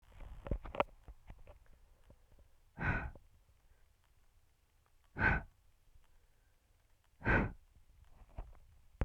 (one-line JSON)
{"exhalation_length": "9.0 s", "exhalation_amplitude": 6019, "exhalation_signal_mean_std_ratio": 0.33, "survey_phase": "beta (2021-08-13 to 2022-03-07)", "age": "18-44", "gender": "Female", "wearing_mask": "No", "symptom_cough_any": true, "symptom_runny_or_blocked_nose": true, "symptom_shortness_of_breath": true, "symptom_fatigue": true, "symptom_change_to_sense_of_smell_or_taste": true, "symptom_loss_of_taste": true, "symptom_onset": "3 days", "smoker_status": "Never smoked", "respiratory_condition_asthma": false, "respiratory_condition_other": false, "recruitment_source": "Test and Trace", "submission_delay": "1 day", "covid_test_result": "Positive", "covid_test_method": "RT-qPCR", "covid_ct_value": 11.7, "covid_ct_gene": "ORF1ab gene", "covid_ct_mean": 12.2, "covid_viral_load": "100000000 copies/ml", "covid_viral_load_category": "High viral load (>1M copies/ml)"}